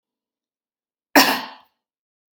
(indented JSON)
{
  "cough_length": "2.3 s",
  "cough_amplitude": 32767,
  "cough_signal_mean_std_ratio": 0.24,
  "survey_phase": "beta (2021-08-13 to 2022-03-07)",
  "age": "45-64",
  "gender": "Female",
  "wearing_mask": "No",
  "symptom_none": true,
  "symptom_onset": "6 days",
  "smoker_status": "Ex-smoker",
  "respiratory_condition_asthma": false,
  "respiratory_condition_other": false,
  "recruitment_source": "REACT",
  "submission_delay": "2 days",
  "covid_test_result": "Negative",
  "covid_test_method": "RT-qPCR",
  "influenza_a_test_result": "Negative",
  "influenza_b_test_result": "Negative"
}